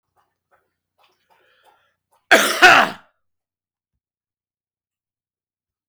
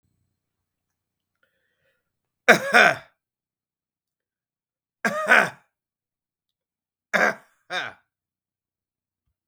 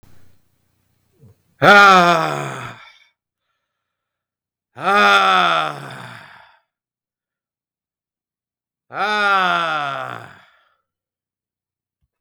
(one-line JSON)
{"cough_length": "5.9 s", "cough_amplitude": 32767, "cough_signal_mean_std_ratio": 0.22, "three_cough_length": "9.5 s", "three_cough_amplitude": 32766, "three_cough_signal_mean_std_ratio": 0.23, "exhalation_length": "12.2 s", "exhalation_amplitude": 32768, "exhalation_signal_mean_std_ratio": 0.36, "survey_phase": "beta (2021-08-13 to 2022-03-07)", "age": "45-64", "gender": "Male", "wearing_mask": "No", "symptom_none": true, "smoker_status": "Ex-smoker", "respiratory_condition_asthma": false, "respiratory_condition_other": false, "recruitment_source": "REACT", "submission_delay": "1 day", "covid_test_result": "Negative", "covid_test_method": "RT-qPCR", "influenza_a_test_result": "Negative", "influenza_b_test_result": "Negative"}